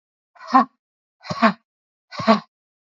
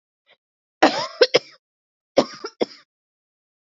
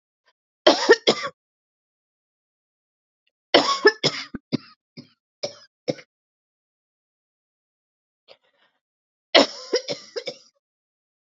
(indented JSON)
{
  "exhalation_length": "3.0 s",
  "exhalation_amplitude": 32768,
  "exhalation_signal_mean_std_ratio": 0.3,
  "cough_length": "3.7 s",
  "cough_amplitude": 29992,
  "cough_signal_mean_std_ratio": 0.25,
  "three_cough_length": "11.3 s",
  "three_cough_amplitude": 30405,
  "three_cough_signal_mean_std_ratio": 0.24,
  "survey_phase": "beta (2021-08-13 to 2022-03-07)",
  "age": "18-44",
  "gender": "Female",
  "wearing_mask": "No",
  "symptom_cough_any": true,
  "symptom_runny_or_blocked_nose": true,
  "symptom_sore_throat": true,
  "symptom_fatigue": true,
  "symptom_fever_high_temperature": true,
  "symptom_headache": true,
  "symptom_onset": "3 days",
  "smoker_status": "Ex-smoker",
  "respiratory_condition_asthma": false,
  "respiratory_condition_other": false,
  "recruitment_source": "Test and Trace",
  "submission_delay": "2 days",
  "covid_test_result": "Positive",
  "covid_test_method": "RT-qPCR",
  "covid_ct_value": 30.4,
  "covid_ct_gene": "N gene"
}